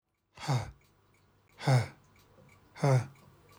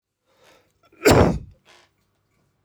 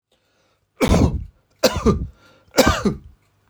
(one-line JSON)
{"exhalation_length": "3.6 s", "exhalation_amplitude": 5867, "exhalation_signal_mean_std_ratio": 0.37, "cough_length": "2.6 s", "cough_amplitude": 21060, "cough_signal_mean_std_ratio": 0.29, "three_cough_length": "3.5 s", "three_cough_amplitude": 26991, "three_cough_signal_mean_std_ratio": 0.44, "survey_phase": "alpha (2021-03-01 to 2021-08-12)", "age": "45-64", "gender": "Male", "wearing_mask": "No", "symptom_none": true, "smoker_status": "Never smoked", "respiratory_condition_asthma": false, "respiratory_condition_other": false, "recruitment_source": "REACT", "submission_delay": "3 days", "covid_test_result": "Negative", "covid_test_method": "RT-qPCR"}